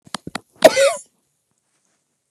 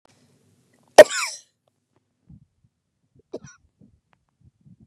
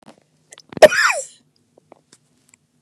exhalation_length: 2.3 s
exhalation_amplitude: 32768
exhalation_signal_mean_std_ratio: 0.26
three_cough_length: 4.9 s
three_cough_amplitude: 32768
three_cough_signal_mean_std_ratio: 0.12
cough_length: 2.8 s
cough_amplitude: 32768
cough_signal_mean_std_ratio: 0.23
survey_phase: beta (2021-08-13 to 2022-03-07)
age: 65+
gender: Female
wearing_mask: 'No'
symptom_shortness_of_breath: true
symptom_fatigue: true
smoker_status: Never smoked
respiratory_condition_asthma: true
respiratory_condition_other: false
recruitment_source: REACT
submission_delay: 2 days
covid_test_result: Negative
covid_test_method: RT-qPCR
influenza_a_test_result: Negative
influenza_b_test_result: Negative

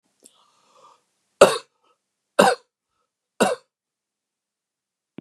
three_cough_length: 5.2 s
three_cough_amplitude: 32768
three_cough_signal_mean_std_ratio: 0.2
survey_phase: beta (2021-08-13 to 2022-03-07)
age: 65+
gender: Male
wearing_mask: 'No'
symptom_none: true
smoker_status: Never smoked
respiratory_condition_asthma: false
respiratory_condition_other: false
recruitment_source: REACT
submission_delay: 0 days
covid_test_result: Negative
covid_test_method: RT-qPCR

